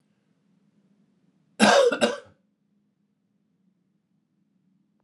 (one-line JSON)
{"cough_length": "5.0 s", "cough_amplitude": 21986, "cough_signal_mean_std_ratio": 0.25, "survey_phase": "alpha (2021-03-01 to 2021-08-12)", "age": "45-64", "gender": "Male", "wearing_mask": "No", "symptom_cough_any": true, "symptom_diarrhoea": true, "symptom_onset": "5 days", "smoker_status": "Never smoked", "respiratory_condition_asthma": true, "respiratory_condition_other": false, "recruitment_source": "Test and Trace", "submission_delay": "2 days", "covid_test_result": "Positive", "covid_test_method": "RT-qPCR"}